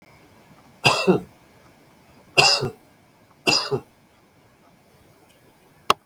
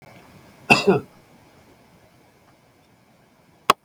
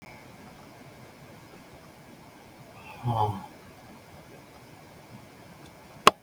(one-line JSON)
{"three_cough_length": "6.1 s", "three_cough_amplitude": 32768, "three_cough_signal_mean_std_ratio": 0.31, "cough_length": "3.8 s", "cough_amplitude": 32768, "cough_signal_mean_std_ratio": 0.22, "exhalation_length": "6.2 s", "exhalation_amplitude": 32768, "exhalation_signal_mean_std_ratio": 0.26, "survey_phase": "beta (2021-08-13 to 2022-03-07)", "age": "65+", "gender": "Male", "wearing_mask": "No", "symptom_none": true, "smoker_status": "Never smoked", "respiratory_condition_asthma": false, "respiratory_condition_other": false, "recruitment_source": "REACT", "submission_delay": "2 days", "covid_test_result": "Negative", "covid_test_method": "RT-qPCR"}